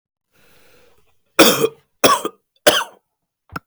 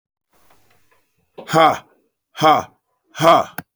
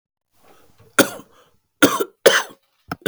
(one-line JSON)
{"three_cough_length": "3.7 s", "three_cough_amplitude": 32768, "three_cough_signal_mean_std_ratio": 0.32, "exhalation_length": "3.8 s", "exhalation_amplitude": 32046, "exhalation_signal_mean_std_ratio": 0.35, "cough_length": "3.1 s", "cough_amplitude": 31986, "cough_signal_mean_std_ratio": 0.29, "survey_phase": "beta (2021-08-13 to 2022-03-07)", "age": "45-64", "gender": "Male", "wearing_mask": "No", "symptom_cough_any": true, "symptom_runny_or_blocked_nose": true, "symptom_sore_throat": true, "symptom_headache": true, "symptom_loss_of_taste": true, "symptom_onset": "5 days", "smoker_status": "Never smoked", "respiratory_condition_asthma": false, "respiratory_condition_other": false, "recruitment_source": "Test and Trace", "submission_delay": "1 day", "covid_test_result": "Positive", "covid_test_method": "RT-qPCR", "covid_ct_value": 19.9, "covid_ct_gene": "N gene"}